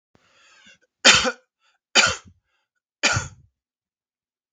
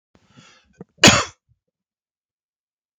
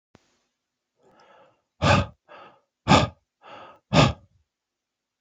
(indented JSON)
{
  "three_cough_length": "4.5 s",
  "three_cough_amplitude": 32768,
  "three_cough_signal_mean_std_ratio": 0.28,
  "cough_length": "3.0 s",
  "cough_amplitude": 32768,
  "cough_signal_mean_std_ratio": 0.19,
  "exhalation_length": "5.2 s",
  "exhalation_amplitude": 24914,
  "exhalation_signal_mean_std_ratio": 0.28,
  "survey_phase": "beta (2021-08-13 to 2022-03-07)",
  "age": "45-64",
  "gender": "Male",
  "wearing_mask": "No",
  "symptom_cough_any": true,
  "symptom_sore_throat": true,
  "symptom_headache": true,
  "symptom_onset": "6 days",
  "smoker_status": "Never smoked",
  "respiratory_condition_asthma": false,
  "respiratory_condition_other": false,
  "recruitment_source": "REACT",
  "submission_delay": "1 day",
  "covid_test_result": "Negative",
  "covid_test_method": "RT-qPCR"
}